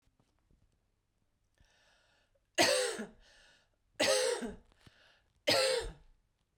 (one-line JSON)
{"three_cough_length": "6.6 s", "three_cough_amplitude": 7034, "three_cough_signal_mean_std_ratio": 0.37, "survey_phase": "beta (2021-08-13 to 2022-03-07)", "age": "45-64", "gender": "Female", "wearing_mask": "No", "symptom_cough_any": true, "symptom_runny_or_blocked_nose": true, "symptom_sore_throat": true, "symptom_headache": true, "symptom_change_to_sense_of_smell_or_taste": true, "symptom_onset": "4 days", "smoker_status": "Never smoked", "respiratory_condition_asthma": false, "respiratory_condition_other": false, "recruitment_source": "Test and Trace", "submission_delay": "1 day", "covid_test_result": "Positive", "covid_test_method": "RT-qPCR", "covid_ct_value": 20.7, "covid_ct_gene": "ORF1ab gene", "covid_ct_mean": 21.3, "covid_viral_load": "100000 copies/ml", "covid_viral_load_category": "Low viral load (10K-1M copies/ml)"}